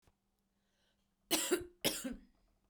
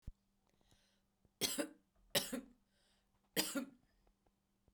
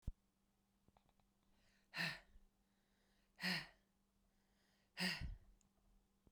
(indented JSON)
{
  "cough_length": "2.7 s",
  "cough_amplitude": 3973,
  "cough_signal_mean_std_ratio": 0.36,
  "three_cough_length": "4.7 s",
  "three_cough_amplitude": 3139,
  "three_cough_signal_mean_std_ratio": 0.31,
  "exhalation_length": "6.3 s",
  "exhalation_amplitude": 1186,
  "exhalation_signal_mean_std_ratio": 0.32,
  "survey_phase": "beta (2021-08-13 to 2022-03-07)",
  "age": "45-64",
  "gender": "Female",
  "wearing_mask": "No",
  "symptom_runny_or_blocked_nose": true,
  "symptom_sore_throat": true,
  "symptom_fatigue": true,
  "symptom_other": true,
  "symptom_onset": "4 days",
  "smoker_status": "Never smoked",
  "respiratory_condition_asthma": false,
  "respiratory_condition_other": false,
  "recruitment_source": "Test and Trace",
  "submission_delay": "2 days",
  "covid_test_result": "Positive",
  "covid_test_method": "RT-qPCR",
  "covid_ct_value": 16.7,
  "covid_ct_gene": "ORF1ab gene",
  "covid_ct_mean": 17.3,
  "covid_viral_load": "2200000 copies/ml",
  "covid_viral_load_category": "High viral load (>1M copies/ml)"
}